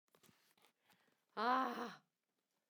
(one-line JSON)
{"exhalation_length": "2.7 s", "exhalation_amplitude": 2165, "exhalation_signal_mean_std_ratio": 0.33, "survey_phase": "beta (2021-08-13 to 2022-03-07)", "age": "45-64", "gender": "Female", "wearing_mask": "No", "symptom_none": true, "symptom_onset": "5 days", "smoker_status": "Ex-smoker", "respiratory_condition_asthma": false, "respiratory_condition_other": false, "recruitment_source": "REACT", "submission_delay": "2 days", "covid_test_result": "Negative", "covid_test_method": "RT-qPCR", "influenza_a_test_result": "Negative", "influenza_b_test_result": "Negative"}